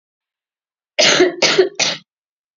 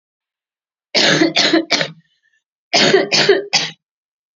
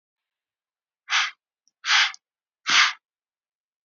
three_cough_length: 2.6 s
three_cough_amplitude: 32767
three_cough_signal_mean_std_ratio: 0.45
cough_length: 4.4 s
cough_amplitude: 32768
cough_signal_mean_std_ratio: 0.51
exhalation_length: 3.8 s
exhalation_amplitude: 19783
exhalation_signal_mean_std_ratio: 0.33
survey_phase: beta (2021-08-13 to 2022-03-07)
age: 18-44
gender: Female
wearing_mask: 'No'
symptom_cough_any: true
symptom_runny_or_blocked_nose: true
symptom_onset: 8 days
smoker_status: Never smoked
respiratory_condition_asthma: false
respiratory_condition_other: false
recruitment_source: REACT
submission_delay: 1 day
covid_test_result: Negative
covid_test_method: RT-qPCR
influenza_a_test_result: Unknown/Void
influenza_b_test_result: Unknown/Void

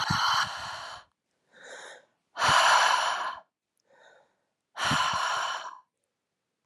exhalation_length: 6.7 s
exhalation_amplitude: 10856
exhalation_signal_mean_std_ratio: 0.51
survey_phase: alpha (2021-03-01 to 2021-08-12)
age: 18-44
gender: Female
wearing_mask: 'No'
symptom_headache: true
smoker_status: Never smoked
respiratory_condition_asthma: false
respiratory_condition_other: false
recruitment_source: Test and Trace
submission_delay: 1 day
covid_test_result: Positive
covid_test_method: RT-qPCR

